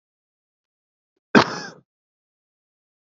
{
  "cough_length": "3.1 s",
  "cough_amplitude": 27394,
  "cough_signal_mean_std_ratio": 0.16,
  "survey_phase": "beta (2021-08-13 to 2022-03-07)",
  "age": "45-64",
  "gender": "Male",
  "wearing_mask": "No",
  "symptom_none": true,
  "smoker_status": "Never smoked",
  "respiratory_condition_asthma": false,
  "respiratory_condition_other": false,
  "recruitment_source": "Test and Trace",
  "submission_delay": "0 days",
  "covid_test_result": "Negative",
  "covid_test_method": "LFT"
}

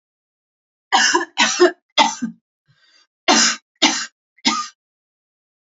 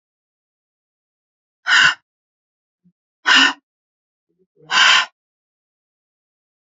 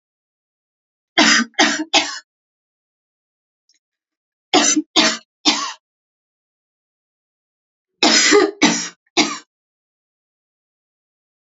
{
  "cough_length": "5.6 s",
  "cough_amplitude": 32123,
  "cough_signal_mean_std_ratio": 0.4,
  "exhalation_length": "6.7 s",
  "exhalation_amplitude": 32699,
  "exhalation_signal_mean_std_ratio": 0.29,
  "three_cough_length": "11.5 s",
  "three_cough_amplitude": 32767,
  "three_cough_signal_mean_std_ratio": 0.34,
  "survey_phase": "alpha (2021-03-01 to 2021-08-12)",
  "age": "45-64",
  "gender": "Female",
  "wearing_mask": "No",
  "symptom_none": true,
  "symptom_onset": "13 days",
  "smoker_status": "Never smoked",
  "respiratory_condition_asthma": false,
  "respiratory_condition_other": false,
  "recruitment_source": "REACT",
  "submission_delay": "1 day",
  "covid_test_result": "Negative",
  "covid_test_method": "RT-qPCR"
}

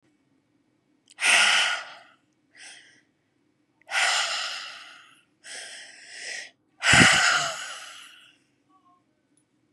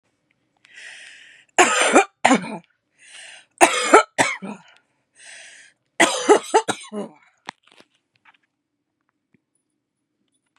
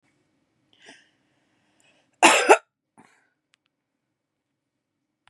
{
  "exhalation_length": "9.7 s",
  "exhalation_amplitude": 26035,
  "exhalation_signal_mean_std_ratio": 0.38,
  "three_cough_length": "10.6 s",
  "three_cough_amplitude": 32768,
  "three_cough_signal_mean_std_ratio": 0.31,
  "cough_length": "5.3 s",
  "cough_amplitude": 32767,
  "cough_signal_mean_std_ratio": 0.19,
  "survey_phase": "beta (2021-08-13 to 2022-03-07)",
  "age": "18-44",
  "gender": "Female",
  "wearing_mask": "No",
  "symptom_cough_any": true,
  "symptom_runny_or_blocked_nose": true,
  "symptom_shortness_of_breath": true,
  "symptom_sore_throat": true,
  "symptom_fatigue": true,
  "symptom_headache": true,
  "smoker_status": "Current smoker (e-cigarettes or vapes only)",
  "respiratory_condition_asthma": true,
  "respiratory_condition_other": false,
  "recruitment_source": "Test and Trace",
  "submission_delay": "2 days",
  "covid_test_result": "Positive",
  "covid_test_method": "RT-qPCR",
  "covid_ct_value": 26.2,
  "covid_ct_gene": "ORF1ab gene",
  "covid_ct_mean": 27.4,
  "covid_viral_load": "990 copies/ml",
  "covid_viral_load_category": "Minimal viral load (< 10K copies/ml)"
}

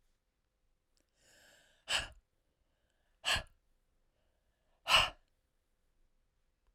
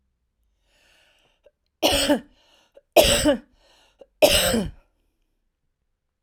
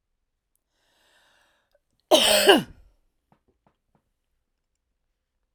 {
  "exhalation_length": "6.7 s",
  "exhalation_amplitude": 6665,
  "exhalation_signal_mean_std_ratio": 0.22,
  "three_cough_length": "6.2 s",
  "three_cough_amplitude": 32767,
  "three_cough_signal_mean_std_ratio": 0.34,
  "cough_length": "5.5 s",
  "cough_amplitude": 26373,
  "cough_signal_mean_std_ratio": 0.23,
  "survey_phase": "alpha (2021-03-01 to 2021-08-12)",
  "age": "45-64",
  "gender": "Female",
  "wearing_mask": "No",
  "symptom_fatigue": true,
  "smoker_status": "Ex-smoker",
  "respiratory_condition_asthma": false,
  "respiratory_condition_other": true,
  "recruitment_source": "REACT",
  "submission_delay": "5 days",
  "covid_test_result": "Negative",
  "covid_test_method": "RT-qPCR"
}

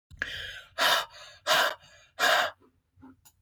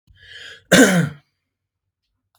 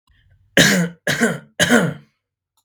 {
  "exhalation_length": "3.4 s",
  "exhalation_amplitude": 11062,
  "exhalation_signal_mean_std_ratio": 0.47,
  "cough_length": "2.4 s",
  "cough_amplitude": 32768,
  "cough_signal_mean_std_ratio": 0.33,
  "three_cough_length": "2.6 s",
  "three_cough_amplitude": 32768,
  "three_cough_signal_mean_std_ratio": 0.48,
  "survey_phase": "beta (2021-08-13 to 2022-03-07)",
  "age": "45-64",
  "gender": "Male",
  "wearing_mask": "No",
  "symptom_none": true,
  "smoker_status": "Never smoked",
  "respiratory_condition_asthma": true,
  "respiratory_condition_other": false,
  "recruitment_source": "REACT",
  "submission_delay": "1 day",
  "covid_test_result": "Negative",
  "covid_test_method": "RT-qPCR"
}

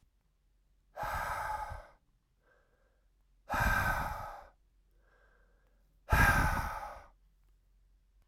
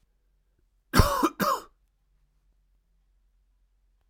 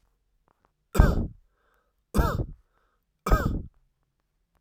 {
  "exhalation_length": "8.3 s",
  "exhalation_amplitude": 7962,
  "exhalation_signal_mean_std_ratio": 0.41,
  "cough_length": "4.1 s",
  "cough_amplitude": 21833,
  "cough_signal_mean_std_ratio": 0.27,
  "three_cough_length": "4.6 s",
  "three_cough_amplitude": 27497,
  "three_cough_signal_mean_std_ratio": 0.33,
  "survey_phase": "beta (2021-08-13 to 2022-03-07)",
  "age": "18-44",
  "gender": "Male",
  "wearing_mask": "No",
  "symptom_cough_any": true,
  "symptom_new_continuous_cough": true,
  "symptom_runny_or_blocked_nose": true,
  "symptom_sore_throat": true,
  "symptom_fever_high_temperature": true,
  "symptom_onset": "3 days",
  "smoker_status": "Never smoked",
  "respiratory_condition_asthma": false,
  "respiratory_condition_other": false,
  "recruitment_source": "Test and Trace",
  "submission_delay": "1 day",
  "covid_test_result": "Positive",
  "covid_test_method": "RT-qPCR",
  "covid_ct_value": 19.9,
  "covid_ct_gene": "N gene"
}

